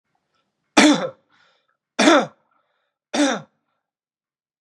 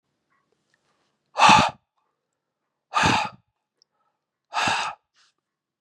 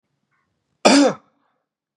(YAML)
three_cough_length: 4.6 s
three_cough_amplitude: 32767
three_cough_signal_mean_std_ratio: 0.31
exhalation_length: 5.8 s
exhalation_amplitude: 27445
exhalation_signal_mean_std_ratio: 0.3
cough_length: 2.0 s
cough_amplitude: 32767
cough_signal_mean_std_ratio: 0.31
survey_phase: beta (2021-08-13 to 2022-03-07)
age: 18-44
gender: Male
wearing_mask: 'No'
symptom_runny_or_blocked_nose: true
symptom_fatigue: true
symptom_onset: 4 days
smoker_status: Never smoked
respiratory_condition_asthma: false
respiratory_condition_other: false
recruitment_source: Test and Trace
submission_delay: 2 days
covid_test_result: Positive
covid_test_method: RT-qPCR
covid_ct_value: 20.4
covid_ct_gene: N gene